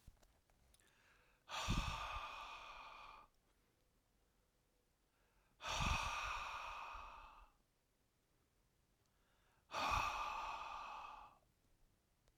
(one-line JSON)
{"exhalation_length": "12.4 s", "exhalation_amplitude": 1562, "exhalation_signal_mean_std_ratio": 0.49, "survey_phase": "alpha (2021-03-01 to 2021-08-12)", "age": "45-64", "gender": "Male", "wearing_mask": "No", "symptom_cough_any": true, "symptom_shortness_of_breath": true, "symptom_fatigue": true, "symptom_headache": true, "symptom_onset": "3 days", "smoker_status": "Ex-smoker", "respiratory_condition_asthma": false, "respiratory_condition_other": false, "recruitment_source": "Test and Trace", "submission_delay": "2 days", "covid_test_result": "Positive", "covid_test_method": "RT-qPCR", "covid_ct_value": 23.4, "covid_ct_gene": "ORF1ab gene", "covid_ct_mean": 24.3, "covid_viral_load": "11000 copies/ml", "covid_viral_load_category": "Low viral load (10K-1M copies/ml)"}